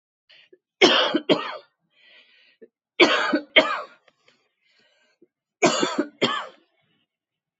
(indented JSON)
{
  "three_cough_length": "7.6 s",
  "three_cough_amplitude": 27470,
  "three_cough_signal_mean_std_ratio": 0.36,
  "survey_phase": "beta (2021-08-13 to 2022-03-07)",
  "age": "45-64",
  "gender": "Female",
  "wearing_mask": "No",
  "symptom_cough_any": true,
  "symptom_onset": "3 days",
  "smoker_status": "Never smoked",
  "respiratory_condition_asthma": false,
  "respiratory_condition_other": false,
  "recruitment_source": "Test and Trace",
  "submission_delay": "2 days",
  "covid_test_result": "Positive",
  "covid_test_method": "ePCR"
}